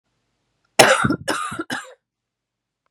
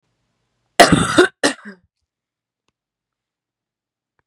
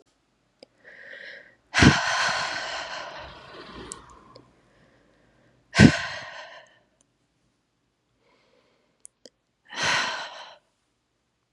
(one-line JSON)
{"three_cough_length": "2.9 s", "three_cough_amplitude": 32768, "three_cough_signal_mean_std_ratio": 0.34, "cough_length": "4.3 s", "cough_amplitude": 32768, "cough_signal_mean_std_ratio": 0.25, "exhalation_length": "11.5 s", "exhalation_amplitude": 32340, "exhalation_signal_mean_std_ratio": 0.28, "survey_phase": "beta (2021-08-13 to 2022-03-07)", "age": "18-44", "gender": "Female", "wearing_mask": "No", "symptom_cough_any": true, "symptom_shortness_of_breath": true, "symptom_fatigue": true, "symptom_headache": true, "symptom_onset": "2 days", "smoker_status": "Never smoked", "respiratory_condition_asthma": true, "respiratory_condition_other": false, "recruitment_source": "REACT", "submission_delay": "0 days", "covid_test_result": "Negative", "covid_test_method": "RT-qPCR", "influenza_a_test_result": "Unknown/Void", "influenza_b_test_result": "Unknown/Void"}